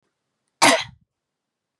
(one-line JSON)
{"cough_length": "1.8 s", "cough_amplitude": 29873, "cough_signal_mean_std_ratio": 0.26, "survey_phase": "beta (2021-08-13 to 2022-03-07)", "age": "18-44", "gender": "Female", "wearing_mask": "No", "symptom_cough_any": true, "symptom_runny_or_blocked_nose": true, "symptom_sore_throat": true, "symptom_fatigue": true, "symptom_headache": true, "symptom_change_to_sense_of_smell_or_taste": true, "symptom_onset": "4 days", "smoker_status": "Never smoked", "respiratory_condition_asthma": false, "respiratory_condition_other": false, "recruitment_source": "Test and Trace", "submission_delay": "2 days", "covid_test_result": "Positive", "covid_test_method": "RT-qPCR", "covid_ct_value": 20.6, "covid_ct_gene": "ORF1ab gene", "covid_ct_mean": 21.0, "covid_viral_load": "130000 copies/ml", "covid_viral_load_category": "Low viral load (10K-1M copies/ml)"}